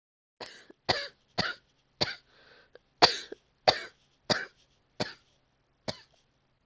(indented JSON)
{
  "cough_length": "6.7 s",
  "cough_amplitude": 25908,
  "cough_signal_mean_std_ratio": 0.24,
  "survey_phase": "alpha (2021-03-01 to 2021-08-12)",
  "age": "18-44",
  "gender": "Female",
  "wearing_mask": "No",
  "symptom_cough_any": true,
  "symptom_new_continuous_cough": true,
  "symptom_fever_high_temperature": true,
  "symptom_headache": true,
  "symptom_change_to_sense_of_smell_or_taste": true,
  "symptom_loss_of_taste": true,
  "symptom_onset": "3 days",
  "smoker_status": "Never smoked",
  "respiratory_condition_asthma": false,
  "respiratory_condition_other": false,
  "recruitment_source": "Test and Trace",
  "submission_delay": "2 days",
  "covid_test_result": "Positive",
  "covid_test_method": "RT-qPCR",
  "covid_ct_value": 15.3,
  "covid_ct_gene": "N gene",
  "covid_ct_mean": 16.6,
  "covid_viral_load": "3500000 copies/ml",
  "covid_viral_load_category": "High viral load (>1M copies/ml)"
}